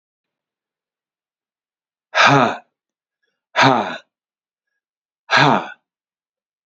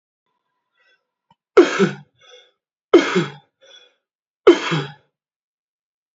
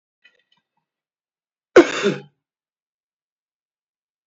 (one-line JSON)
{"exhalation_length": "6.7 s", "exhalation_amplitude": 29373, "exhalation_signal_mean_std_ratio": 0.31, "three_cough_length": "6.1 s", "three_cough_amplitude": 32768, "three_cough_signal_mean_std_ratio": 0.27, "cough_length": "4.3 s", "cough_amplitude": 28654, "cough_signal_mean_std_ratio": 0.17, "survey_phase": "beta (2021-08-13 to 2022-03-07)", "age": "45-64", "gender": "Male", "wearing_mask": "No", "symptom_runny_or_blocked_nose": true, "symptom_headache": true, "symptom_change_to_sense_of_smell_or_taste": true, "smoker_status": "Never smoked", "respiratory_condition_asthma": false, "respiratory_condition_other": false, "recruitment_source": "Test and Trace", "submission_delay": "2 days", "covid_test_result": "Positive", "covid_test_method": "ePCR"}